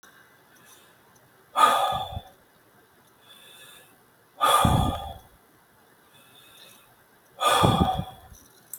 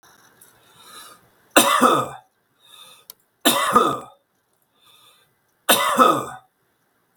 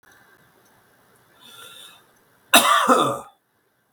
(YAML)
exhalation_length: 8.8 s
exhalation_amplitude: 18159
exhalation_signal_mean_std_ratio: 0.39
three_cough_length: 7.2 s
three_cough_amplitude: 32768
three_cough_signal_mean_std_ratio: 0.38
cough_length: 3.9 s
cough_amplitude: 32768
cough_signal_mean_std_ratio: 0.33
survey_phase: beta (2021-08-13 to 2022-03-07)
age: 65+
gender: Male
wearing_mask: 'No'
symptom_none: true
smoker_status: Ex-smoker
respiratory_condition_asthma: false
respiratory_condition_other: false
recruitment_source: REACT
submission_delay: 2 days
covid_test_result: Negative
covid_test_method: RT-qPCR
influenza_a_test_result: Negative
influenza_b_test_result: Negative